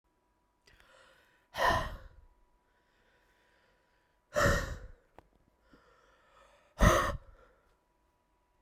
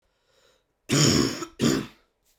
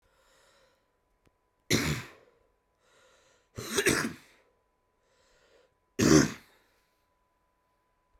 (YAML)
exhalation_length: 8.6 s
exhalation_amplitude: 10644
exhalation_signal_mean_std_ratio: 0.28
cough_length: 2.4 s
cough_amplitude: 14085
cough_signal_mean_std_ratio: 0.46
three_cough_length: 8.2 s
three_cough_amplitude: 11634
three_cough_signal_mean_std_ratio: 0.26
survey_phase: beta (2021-08-13 to 2022-03-07)
age: 18-44
gender: Male
wearing_mask: 'No'
symptom_cough_any: true
symptom_runny_or_blocked_nose: true
symptom_sore_throat: true
symptom_fatigue: true
symptom_headache: true
symptom_onset: 4 days
smoker_status: Never smoked
respiratory_condition_asthma: true
respiratory_condition_other: false
recruitment_source: Test and Trace
submission_delay: 1 day
covid_test_result: Positive
covid_test_method: RT-qPCR